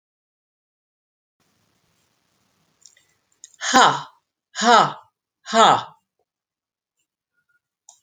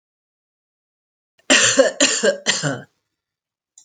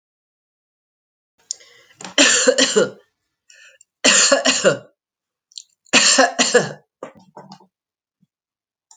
{"exhalation_length": "8.0 s", "exhalation_amplitude": 30237, "exhalation_signal_mean_std_ratio": 0.26, "cough_length": "3.8 s", "cough_amplitude": 32553, "cough_signal_mean_std_ratio": 0.4, "three_cough_length": "9.0 s", "three_cough_amplitude": 32210, "three_cough_signal_mean_std_ratio": 0.38, "survey_phase": "alpha (2021-03-01 to 2021-08-12)", "age": "65+", "gender": "Female", "wearing_mask": "No", "symptom_none": true, "smoker_status": "Never smoked", "respiratory_condition_asthma": false, "respiratory_condition_other": false, "recruitment_source": "REACT", "submission_delay": "2 days", "covid_test_result": "Negative", "covid_test_method": "RT-qPCR"}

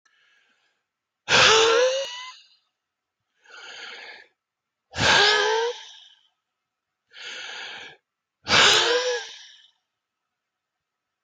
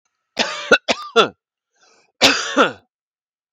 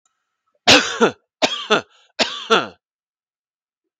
{"exhalation_length": "11.2 s", "exhalation_amplitude": 21257, "exhalation_signal_mean_std_ratio": 0.4, "cough_length": "3.5 s", "cough_amplitude": 32768, "cough_signal_mean_std_ratio": 0.37, "three_cough_length": "4.0 s", "three_cough_amplitude": 32768, "three_cough_signal_mean_std_ratio": 0.35, "survey_phase": "beta (2021-08-13 to 2022-03-07)", "age": "18-44", "gender": "Male", "wearing_mask": "No", "symptom_fatigue": true, "smoker_status": "Never smoked", "respiratory_condition_asthma": false, "respiratory_condition_other": false, "recruitment_source": "REACT", "submission_delay": "1 day", "covid_test_result": "Negative", "covid_test_method": "RT-qPCR"}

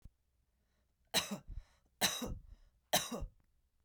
{"three_cough_length": "3.8 s", "three_cough_amplitude": 4537, "three_cough_signal_mean_std_ratio": 0.37, "survey_phase": "beta (2021-08-13 to 2022-03-07)", "age": "45-64", "gender": "Female", "wearing_mask": "No", "symptom_none": true, "smoker_status": "Never smoked", "respiratory_condition_asthma": false, "respiratory_condition_other": false, "recruitment_source": "REACT", "submission_delay": "2 days", "covid_test_result": "Negative", "covid_test_method": "RT-qPCR", "influenza_a_test_result": "Negative", "influenza_b_test_result": "Negative"}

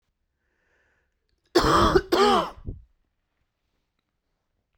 {"cough_length": "4.8 s", "cough_amplitude": 16685, "cough_signal_mean_std_ratio": 0.35, "survey_phase": "beta (2021-08-13 to 2022-03-07)", "age": "18-44", "gender": "Male", "wearing_mask": "No", "symptom_runny_or_blocked_nose": true, "symptom_fatigue": true, "symptom_onset": "13 days", "smoker_status": "Ex-smoker", "respiratory_condition_asthma": false, "respiratory_condition_other": false, "recruitment_source": "REACT", "submission_delay": "1 day", "covid_test_result": "Negative", "covid_test_method": "RT-qPCR", "influenza_a_test_result": "Unknown/Void", "influenza_b_test_result": "Unknown/Void"}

